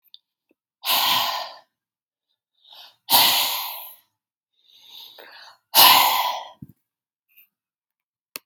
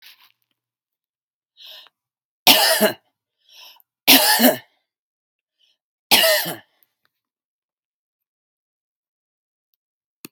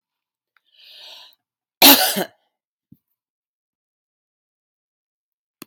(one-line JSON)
{"exhalation_length": "8.5 s", "exhalation_amplitude": 32768, "exhalation_signal_mean_std_ratio": 0.35, "three_cough_length": "10.3 s", "three_cough_amplitude": 32768, "three_cough_signal_mean_std_ratio": 0.27, "cough_length": "5.7 s", "cough_amplitude": 32768, "cough_signal_mean_std_ratio": 0.19, "survey_phase": "beta (2021-08-13 to 2022-03-07)", "age": "45-64", "gender": "Female", "wearing_mask": "No", "symptom_none": true, "smoker_status": "Ex-smoker", "respiratory_condition_asthma": false, "respiratory_condition_other": false, "recruitment_source": "REACT", "submission_delay": "6 days", "covid_test_result": "Negative", "covid_test_method": "RT-qPCR", "influenza_a_test_result": "Negative", "influenza_b_test_result": "Negative"}